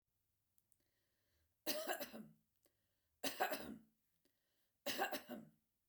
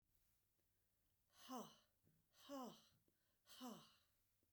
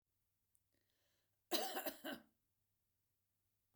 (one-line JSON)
{"three_cough_length": "5.9 s", "three_cough_amplitude": 1824, "three_cough_signal_mean_std_ratio": 0.38, "exhalation_length": "4.5 s", "exhalation_amplitude": 266, "exhalation_signal_mean_std_ratio": 0.42, "cough_length": "3.8 s", "cough_amplitude": 2227, "cough_signal_mean_std_ratio": 0.29, "survey_phase": "beta (2021-08-13 to 2022-03-07)", "age": "45-64", "gender": "Female", "wearing_mask": "No", "symptom_none": true, "smoker_status": "Ex-smoker", "respiratory_condition_asthma": false, "respiratory_condition_other": false, "recruitment_source": "REACT", "submission_delay": "0 days", "covid_test_result": "Negative", "covid_test_method": "RT-qPCR", "influenza_a_test_result": "Negative", "influenza_b_test_result": "Negative"}